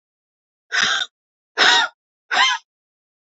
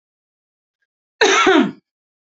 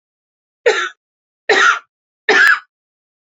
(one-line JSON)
{"exhalation_length": "3.3 s", "exhalation_amplitude": 30699, "exhalation_signal_mean_std_ratio": 0.41, "cough_length": "2.4 s", "cough_amplitude": 31583, "cough_signal_mean_std_ratio": 0.37, "three_cough_length": "3.2 s", "three_cough_amplitude": 29188, "three_cough_signal_mean_std_ratio": 0.41, "survey_phase": "beta (2021-08-13 to 2022-03-07)", "age": "45-64", "gender": "Female", "wearing_mask": "No", "symptom_none": true, "smoker_status": "Never smoked", "respiratory_condition_asthma": false, "respiratory_condition_other": false, "recruitment_source": "REACT", "submission_delay": "2 days", "covid_test_result": "Negative", "covid_test_method": "RT-qPCR", "influenza_a_test_result": "Negative", "influenza_b_test_result": "Negative"}